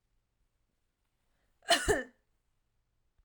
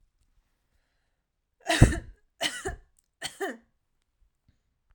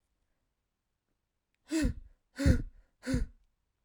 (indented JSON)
{
  "cough_length": "3.2 s",
  "cough_amplitude": 6804,
  "cough_signal_mean_std_ratio": 0.23,
  "three_cough_length": "4.9 s",
  "three_cough_amplitude": 25629,
  "three_cough_signal_mean_std_ratio": 0.22,
  "exhalation_length": "3.8 s",
  "exhalation_amplitude": 8142,
  "exhalation_signal_mean_std_ratio": 0.34,
  "survey_phase": "alpha (2021-03-01 to 2021-08-12)",
  "age": "18-44",
  "gender": "Female",
  "wearing_mask": "No",
  "symptom_none": true,
  "smoker_status": "Never smoked",
  "respiratory_condition_asthma": false,
  "respiratory_condition_other": false,
  "recruitment_source": "REACT",
  "submission_delay": "1 day",
  "covid_test_result": "Negative",
  "covid_test_method": "RT-qPCR"
}